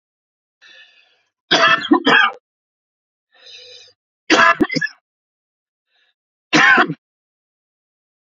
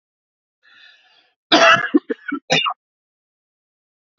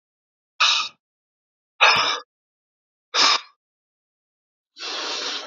{
  "three_cough_length": "8.3 s",
  "three_cough_amplitude": 32058,
  "three_cough_signal_mean_std_ratio": 0.34,
  "cough_length": "4.2 s",
  "cough_amplitude": 30471,
  "cough_signal_mean_std_ratio": 0.31,
  "exhalation_length": "5.5 s",
  "exhalation_amplitude": 28491,
  "exhalation_signal_mean_std_ratio": 0.37,
  "survey_phase": "beta (2021-08-13 to 2022-03-07)",
  "age": "45-64",
  "gender": "Male",
  "wearing_mask": "No",
  "symptom_new_continuous_cough": true,
  "symptom_runny_or_blocked_nose": true,
  "symptom_fatigue": true,
  "symptom_change_to_sense_of_smell_or_taste": true,
  "symptom_other": true,
  "symptom_onset": "4 days",
  "smoker_status": "Ex-smoker",
  "respiratory_condition_asthma": false,
  "respiratory_condition_other": false,
  "recruitment_source": "Test and Trace",
  "submission_delay": "2 days",
  "covid_test_result": "Positive",
  "covid_test_method": "RT-qPCR",
  "covid_ct_value": 12.6,
  "covid_ct_gene": "ORF1ab gene",
  "covid_ct_mean": 13.1,
  "covid_viral_load": "50000000 copies/ml",
  "covid_viral_load_category": "High viral load (>1M copies/ml)"
}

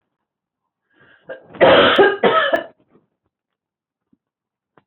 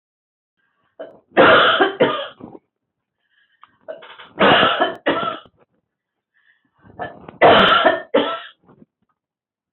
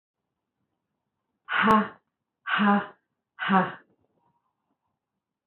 {
  "cough_length": "4.9 s",
  "cough_amplitude": 26707,
  "cough_signal_mean_std_ratio": 0.36,
  "three_cough_length": "9.7 s",
  "three_cough_amplitude": 26896,
  "three_cough_signal_mean_std_ratio": 0.41,
  "exhalation_length": "5.5 s",
  "exhalation_amplitude": 13982,
  "exhalation_signal_mean_std_ratio": 0.34,
  "survey_phase": "beta (2021-08-13 to 2022-03-07)",
  "age": "45-64",
  "gender": "Female",
  "wearing_mask": "No",
  "symptom_cough_any": true,
  "symptom_onset": "12 days",
  "smoker_status": "Never smoked",
  "respiratory_condition_asthma": false,
  "respiratory_condition_other": false,
  "recruitment_source": "REACT",
  "submission_delay": "1 day",
  "covid_test_result": "Negative",
  "covid_test_method": "RT-qPCR",
  "influenza_a_test_result": "Negative",
  "influenza_b_test_result": "Negative"
}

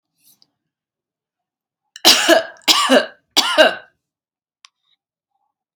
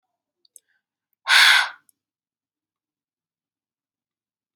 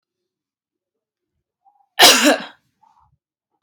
{
  "three_cough_length": "5.8 s",
  "three_cough_amplitude": 32768,
  "three_cough_signal_mean_std_ratio": 0.33,
  "exhalation_length": "4.6 s",
  "exhalation_amplitude": 26631,
  "exhalation_signal_mean_std_ratio": 0.23,
  "cough_length": "3.6 s",
  "cough_amplitude": 32768,
  "cough_signal_mean_std_ratio": 0.26,
  "survey_phase": "beta (2021-08-13 to 2022-03-07)",
  "age": "18-44",
  "gender": "Female",
  "wearing_mask": "No",
  "symptom_none": true,
  "smoker_status": "Never smoked",
  "respiratory_condition_asthma": false,
  "respiratory_condition_other": false,
  "recruitment_source": "REACT",
  "submission_delay": "1 day",
  "covid_test_result": "Negative",
  "covid_test_method": "RT-qPCR",
  "influenza_a_test_result": "Negative",
  "influenza_b_test_result": "Negative"
}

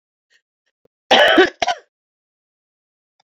{
  "cough_length": "3.2 s",
  "cough_amplitude": 29733,
  "cough_signal_mean_std_ratio": 0.3,
  "survey_phase": "beta (2021-08-13 to 2022-03-07)",
  "age": "45-64",
  "gender": "Female",
  "wearing_mask": "No",
  "symptom_cough_any": true,
  "symptom_new_continuous_cough": true,
  "symptom_runny_or_blocked_nose": true,
  "symptom_diarrhoea": true,
  "symptom_change_to_sense_of_smell_or_taste": true,
  "symptom_loss_of_taste": true,
  "symptom_onset": "4 days",
  "smoker_status": "Ex-smoker",
  "respiratory_condition_asthma": false,
  "respiratory_condition_other": false,
  "recruitment_source": "Test and Trace",
  "submission_delay": "1 day",
  "covid_test_result": "Positive",
  "covid_test_method": "RT-qPCR",
  "covid_ct_value": 13.2,
  "covid_ct_gene": "ORF1ab gene",
  "covid_ct_mean": 13.8,
  "covid_viral_load": "31000000 copies/ml",
  "covid_viral_load_category": "High viral load (>1M copies/ml)"
}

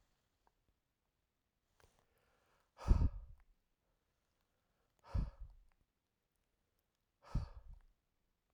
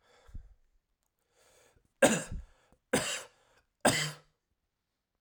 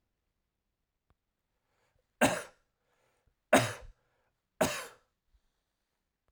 {
  "exhalation_length": "8.5 s",
  "exhalation_amplitude": 4778,
  "exhalation_signal_mean_std_ratio": 0.2,
  "three_cough_length": "5.2 s",
  "three_cough_amplitude": 13626,
  "three_cough_signal_mean_std_ratio": 0.29,
  "cough_length": "6.3 s",
  "cough_amplitude": 11277,
  "cough_signal_mean_std_ratio": 0.21,
  "survey_phase": "alpha (2021-03-01 to 2021-08-12)",
  "age": "18-44",
  "gender": "Male",
  "wearing_mask": "No",
  "symptom_none": true,
  "smoker_status": "Never smoked",
  "respiratory_condition_asthma": false,
  "respiratory_condition_other": false,
  "recruitment_source": "REACT",
  "submission_delay": "1 day",
  "covid_test_result": "Negative",
  "covid_test_method": "RT-qPCR"
}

